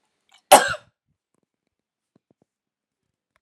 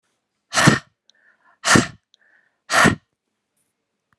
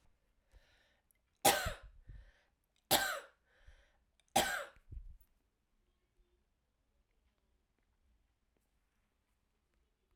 {"cough_length": "3.4 s", "cough_amplitude": 32768, "cough_signal_mean_std_ratio": 0.16, "exhalation_length": "4.2 s", "exhalation_amplitude": 32767, "exhalation_signal_mean_std_ratio": 0.31, "three_cough_length": "10.2 s", "three_cough_amplitude": 7890, "three_cough_signal_mean_std_ratio": 0.23, "survey_phase": "alpha (2021-03-01 to 2021-08-12)", "age": "45-64", "gender": "Female", "wearing_mask": "No", "symptom_cough_any": true, "symptom_fatigue": true, "symptom_headache": true, "symptom_change_to_sense_of_smell_or_taste": true, "smoker_status": "Current smoker (e-cigarettes or vapes only)", "respiratory_condition_asthma": false, "respiratory_condition_other": false, "recruitment_source": "Test and Trace", "submission_delay": "2 days", "covid_test_result": "Positive", "covid_test_method": "RT-qPCR"}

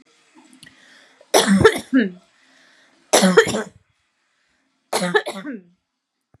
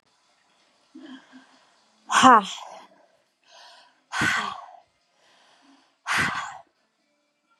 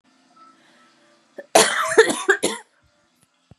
{"three_cough_length": "6.4 s", "three_cough_amplitude": 32729, "three_cough_signal_mean_std_ratio": 0.36, "exhalation_length": "7.6 s", "exhalation_amplitude": 30788, "exhalation_signal_mean_std_ratio": 0.27, "cough_length": "3.6 s", "cough_amplitude": 32609, "cough_signal_mean_std_ratio": 0.34, "survey_phase": "beta (2021-08-13 to 2022-03-07)", "age": "18-44", "gender": "Female", "wearing_mask": "No", "symptom_none": true, "smoker_status": "Never smoked", "respiratory_condition_asthma": false, "respiratory_condition_other": false, "recruitment_source": "REACT", "submission_delay": "4 days", "covid_test_result": "Negative", "covid_test_method": "RT-qPCR", "influenza_a_test_result": "Negative", "influenza_b_test_result": "Negative"}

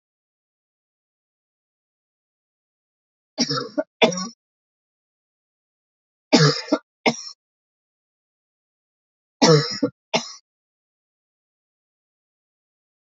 {"three_cough_length": "13.1 s", "three_cough_amplitude": 27204, "three_cough_signal_mean_std_ratio": 0.23, "survey_phase": "beta (2021-08-13 to 2022-03-07)", "age": "45-64", "gender": "Male", "wearing_mask": "No", "symptom_runny_or_blocked_nose": true, "symptom_fatigue": true, "symptom_change_to_sense_of_smell_or_taste": true, "symptom_loss_of_taste": true, "smoker_status": "Never smoked", "respiratory_condition_asthma": false, "respiratory_condition_other": false, "recruitment_source": "Test and Trace", "submission_delay": "2 days", "covid_test_result": "Positive", "covid_test_method": "RT-qPCR", "covid_ct_value": 19.5, "covid_ct_gene": "ORF1ab gene", "covid_ct_mean": 19.6, "covid_viral_load": "380000 copies/ml", "covid_viral_load_category": "Low viral load (10K-1M copies/ml)"}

